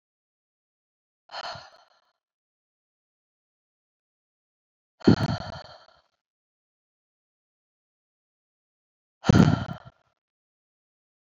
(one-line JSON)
{"exhalation_length": "11.3 s", "exhalation_amplitude": 22049, "exhalation_signal_mean_std_ratio": 0.18, "survey_phase": "beta (2021-08-13 to 2022-03-07)", "age": "18-44", "gender": "Female", "wearing_mask": "No", "symptom_cough_any": true, "symptom_runny_or_blocked_nose": true, "symptom_fever_high_temperature": true, "symptom_headache": true, "symptom_loss_of_taste": true, "smoker_status": "Never smoked", "respiratory_condition_asthma": false, "respiratory_condition_other": false, "recruitment_source": "Test and Trace", "submission_delay": "3 days", "covid_test_result": "Positive", "covid_test_method": "RT-qPCR", "covid_ct_value": 32.4, "covid_ct_gene": "ORF1ab gene", "covid_ct_mean": 33.5, "covid_viral_load": "10 copies/ml", "covid_viral_load_category": "Minimal viral load (< 10K copies/ml)"}